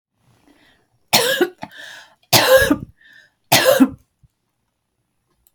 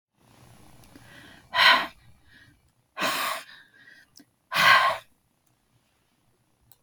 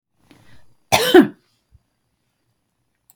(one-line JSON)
{"three_cough_length": "5.5 s", "three_cough_amplitude": 32768, "three_cough_signal_mean_std_ratio": 0.37, "exhalation_length": "6.8 s", "exhalation_amplitude": 18987, "exhalation_signal_mean_std_ratio": 0.32, "cough_length": "3.2 s", "cough_amplitude": 32768, "cough_signal_mean_std_ratio": 0.24, "survey_phase": "beta (2021-08-13 to 2022-03-07)", "age": "65+", "gender": "Female", "wearing_mask": "No", "symptom_runny_or_blocked_nose": true, "symptom_onset": "12 days", "smoker_status": "Ex-smoker", "respiratory_condition_asthma": false, "respiratory_condition_other": false, "recruitment_source": "REACT", "submission_delay": "1 day", "covid_test_result": "Negative", "covid_test_method": "RT-qPCR", "influenza_a_test_result": "Negative", "influenza_b_test_result": "Negative"}